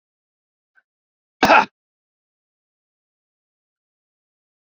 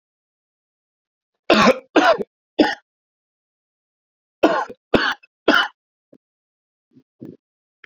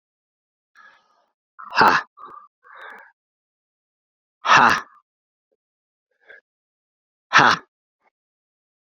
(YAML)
cough_length: 4.6 s
cough_amplitude: 29773
cough_signal_mean_std_ratio: 0.16
three_cough_length: 7.9 s
three_cough_amplitude: 32768
three_cough_signal_mean_std_ratio: 0.3
exhalation_length: 9.0 s
exhalation_amplitude: 28630
exhalation_signal_mean_std_ratio: 0.24
survey_phase: beta (2021-08-13 to 2022-03-07)
age: 45-64
gender: Male
wearing_mask: 'No'
symptom_cough_any: true
symptom_new_continuous_cough: true
symptom_runny_or_blocked_nose: true
symptom_sore_throat: true
symptom_abdominal_pain: true
symptom_headache: true
symptom_onset: 2 days
smoker_status: Never smoked
respiratory_condition_asthma: false
respiratory_condition_other: false
recruitment_source: Test and Trace
submission_delay: 1 day
covid_test_result: Positive
covid_test_method: RT-qPCR